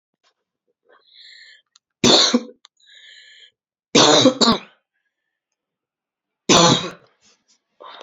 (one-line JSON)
{"three_cough_length": "8.0 s", "three_cough_amplitude": 32034, "three_cough_signal_mean_std_ratio": 0.33, "survey_phase": "beta (2021-08-13 to 2022-03-07)", "age": "18-44", "gender": "Female", "wearing_mask": "No", "symptom_cough_any": true, "symptom_shortness_of_breath": true, "symptom_sore_throat": true, "symptom_fatigue": true, "symptom_headache": true, "symptom_other": true, "symptom_onset": "2 days", "smoker_status": "Ex-smoker", "respiratory_condition_asthma": false, "respiratory_condition_other": false, "recruitment_source": "Test and Trace", "submission_delay": "1 day", "covid_test_result": "Positive", "covid_test_method": "RT-qPCR", "covid_ct_value": 27.5, "covid_ct_gene": "ORF1ab gene"}